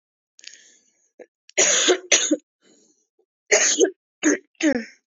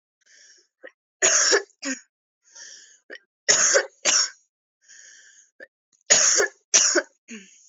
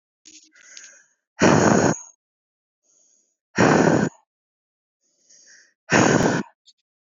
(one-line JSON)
{"cough_length": "5.1 s", "cough_amplitude": 27215, "cough_signal_mean_std_ratio": 0.42, "three_cough_length": "7.7 s", "three_cough_amplitude": 27681, "three_cough_signal_mean_std_ratio": 0.4, "exhalation_length": "7.1 s", "exhalation_amplitude": 24563, "exhalation_signal_mean_std_ratio": 0.39, "survey_phase": "beta (2021-08-13 to 2022-03-07)", "age": "18-44", "gender": "Female", "wearing_mask": "No", "symptom_cough_any": true, "symptom_sore_throat": true, "symptom_fatigue": true, "symptom_other": true, "smoker_status": "Never smoked", "respiratory_condition_asthma": false, "respiratory_condition_other": false, "recruitment_source": "Test and Trace", "submission_delay": "2 days", "covid_test_result": "Positive", "covid_test_method": "RT-qPCR", "covid_ct_value": 28.9, "covid_ct_gene": "N gene"}